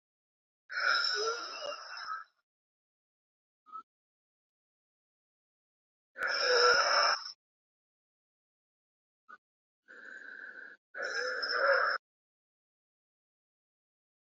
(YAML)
exhalation_length: 14.3 s
exhalation_amplitude: 6870
exhalation_signal_mean_std_ratio: 0.38
survey_phase: beta (2021-08-13 to 2022-03-07)
age: 18-44
gender: Female
wearing_mask: 'No'
symptom_cough_any: true
symptom_runny_or_blocked_nose: true
symptom_sore_throat: true
symptom_fatigue: true
symptom_fever_high_temperature: true
symptom_headache: true
symptom_other: true
smoker_status: Ex-smoker
respiratory_condition_asthma: true
respiratory_condition_other: false
recruitment_source: Test and Trace
submission_delay: 1 day
covid_test_result: Positive
covid_test_method: RT-qPCR